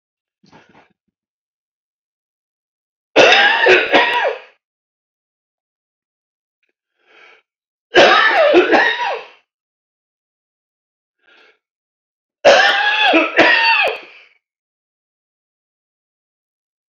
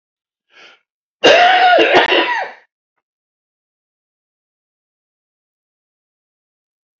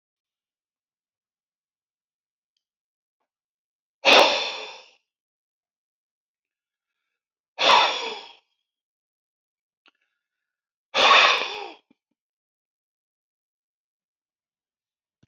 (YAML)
three_cough_length: 16.9 s
three_cough_amplitude: 32078
three_cough_signal_mean_std_ratio: 0.39
cough_length: 7.0 s
cough_amplitude: 29469
cough_signal_mean_std_ratio: 0.34
exhalation_length: 15.3 s
exhalation_amplitude: 26602
exhalation_signal_mean_std_ratio: 0.24
survey_phase: beta (2021-08-13 to 2022-03-07)
age: 65+
gender: Male
wearing_mask: 'No'
symptom_none: true
smoker_status: Ex-smoker
respiratory_condition_asthma: false
respiratory_condition_other: true
recruitment_source: REACT
submission_delay: 3 days
covid_test_result: Negative
covid_test_method: RT-qPCR
influenza_a_test_result: Negative
influenza_b_test_result: Negative